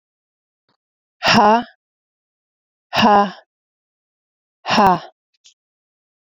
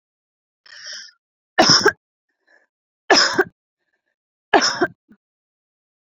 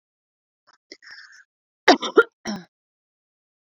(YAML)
exhalation_length: 6.2 s
exhalation_amplitude: 28333
exhalation_signal_mean_std_ratio: 0.33
three_cough_length: 6.1 s
three_cough_amplitude: 32767
three_cough_signal_mean_std_ratio: 0.3
cough_length: 3.7 s
cough_amplitude: 28990
cough_signal_mean_std_ratio: 0.19
survey_phase: beta (2021-08-13 to 2022-03-07)
age: 18-44
gender: Female
wearing_mask: 'No'
symptom_runny_or_blocked_nose: true
smoker_status: Never smoked
respiratory_condition_asthma: false
respiratory_condition_other: false
recruitment_source: Test and Trace
submission_delay: 1 day
covid_test_result: Positive
covid_test_method: RT-qPCR